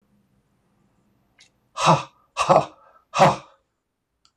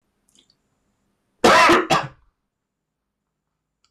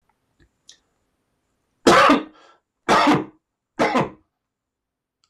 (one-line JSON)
{"exhalation_length": "4.4 s", "exhalation_amplitude": 24118, "exhalation_signal_mean_std_ratio": 0.3, "cough_length": "3.9 s", "cough_amplitude": 22475, "cough_signal_mean_std_ratio": 0.32, "three_cough_length": "5.3 s", "three_cough_amplitude": 25800, "three_cough_signal_mean_std_ratio": 0.36, "survey_phase": "beta (2021-08-13 to 2022-03-07)", "age": "65+", "gender": "Male", "wearing_mask": "No", "symptom_none": true, "smoker_status": "Ex-smoker", "respiratory_condition_asthma": false, "respiratory_condition_other": false, "recruitment_source": "Test and Trace", "submission_delay": "1 day", "covid_test_result": "Negative", "covid_test_method": "RT-qPCR"}